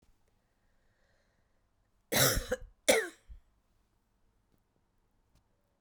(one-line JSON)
{"cough_length": "5.8 s", "cough_amplitude": 9317, "cough_signal_mean_std_ratio": 0.25, "survey_phase": "beta (2021-08-13 to 2022-03-07)", "age": "45-64", "gender": "Female", "wearing_mask": "No", "symptom_cough_any": true, "symptom_runny_or_blocked_nose": true, "symptom_sore_throat": true, "symptom_fatigue": true, "symptom_headache": true, "symptom_change_to_sense_of_smell_or_taste": true, "symptom_onset": "10 days", "smoker_status": "Ex-smoker", "respiratory_condition_asthma": false, "respiratory_condition_other": false, "recruitment_source": "Test and Trace", "submission_delay": "2 days", "covid_test_result": "Positive", "covid_test_method": "RT-qPCR", "covid_ct_value": 16.2, "covid_ct_gene": "ORF1ab gene", "covid_ct_mean": 16.8, "covid_viral_load": "3100000 copies/ml", "covid_viral_load_category": "High viral load (>1M copies/ml)"}